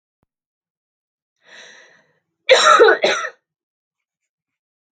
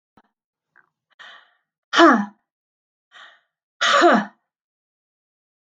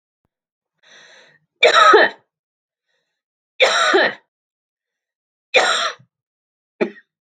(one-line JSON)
{"cough_length": "4.9 s", "cough_amplitude": 32768, "cough_signal_mean_std_ratio": 0.3, "exhalation_length": "5.6 s", "exhalation_amplitude": 32768, "exhalation_signal_mean_std_ratio": 0.28, "three_cough_length": "7.3 s", "three_cough_amplitude": 32768, "three_cough_signal_mean_std_ratio": 0.35, "survey_phase": "beta (2021-08-13 to 2022-03-07)", "age": "45-64", "gender": "Female", "wearing_mask": "No", "symptom_cough_any": true, "symptom_runny_or_blocked_nose": true, "symptom_shortness_of_breath": true, "symptom_fatigue": true, "symptom_headache": true, "symptom_change_to_sense_of_smell_or_taste": true, "symptom_onset": "8 days", "smoker_status": "Never smoked", "respiratory_condition_asthma": true, "respiratory_condition_other": false, "recruitment_source": "REACT", "submission_delay": "3 days", "covid_test_result": "Negative", "covid_test_method": "RT-qPCR", "influenza_a_test_result": "Negative", "influenza_b_test_result": "Negative"}